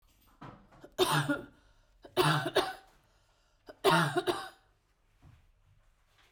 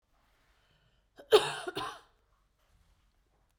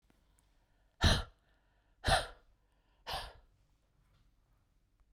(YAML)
three_cough_length: 6.3 s
three_cough_amplitude: 8051
three_cough_signal_mean_std_ratio: 0.39
cough_length: 3.6 s
cough_amplitude: 12226
cough_signal_mean_std_ratio: 0.21
exhalation_length: 5.1 s
exhalation_amplitude: 5443
exhalation_signal_mean_std_ratio: 0.26
survey_phase: beta (2021-08-13 to 2022-03-07)
age: 45-64
gender: Female
wearing_mask: 'No'
symptom_cough_any: true
symptom_new_continuous_cough: true
symptom_runny_or_blocked_nose: true
symptom_sore_throat: true
symptom_fatigue: true
symptom_headache: true
symptom_change_to_sense_of_smell_or_taste: true
symptom_onset: 6 days
smoker_status: Never smoked
respiratory_condition_asthma: false
respiratory_condition_other: false
recruitment_source: Test and Trace
submission_delay: 3 days
covid_test_result: Positive
covid_test_method: RT-qPCR
covid_ct_value: 24.7
covid_ct_gene: S gene
covid_ct_mean: 25.2
covid_viral_load: 5500 copies/ml
covid_viral_load_category: Minimal viral load (< 10K copies/ml)